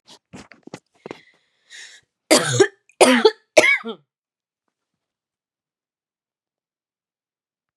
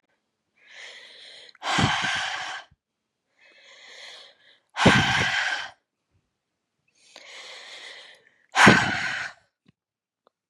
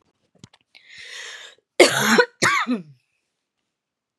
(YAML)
three_cough_length: 7.8 s
three_cough_amplitude: 32768
three_cough_signal_mean_std_ratio: 0.25
exhalation_length: 10.5 s
exhalation_amplitude: 31928
exhalation_signal_mean_std_ratio: 0.36
cough_length: 4.2 s
cough_amplitude: 32617
cough_signal_mean_std_ratio: 0.34
survey_phase: beta (2021-08-13 to 2022-03-07)
age: 18-44
gender: Female
wearing_mask: 'No'
symptom_fatigue: true
symptom_onset: 6 days
smoker_status: Ex-smoker
respiratory_condition_asthma: false
respiratory_condition_other: false
recruitment_source: REACT
submission_delay: 1 day
covid_test_result: Negative
covid_test_method: RT-qPCR
influenza_a_test_result: Negative
influenza_b_test_result: Negative